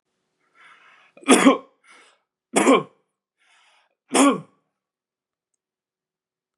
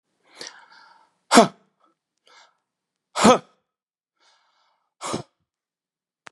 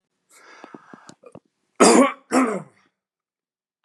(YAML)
three_cough_length: 6.6 s
three_cough_amplitude: 32093
three_cough_signal_mean_std_ratio: 0.27
exhalation_length: 6.3 s
exhalation_amplitude: 32767
exhalation_signal_mean_std_ratio: 0.19
cough_length: 3.8 s
cough_amplitude: 31393
cough_signal_mean_std_ratio: 0.3
survey_phase: beta (2021-08-13 to 2022-03-07)
age: 45-64
gender: Male
wearing_mask: 'No'
symptom_none: true
smoker_status: Never smoked
respiratory_condition_asthma: false
respiratory_condition_other: false
recruitment_source: Test and Trace
submission_delay: 1 day
covid_test_result: Negative
covid_test_method: RT-qPCR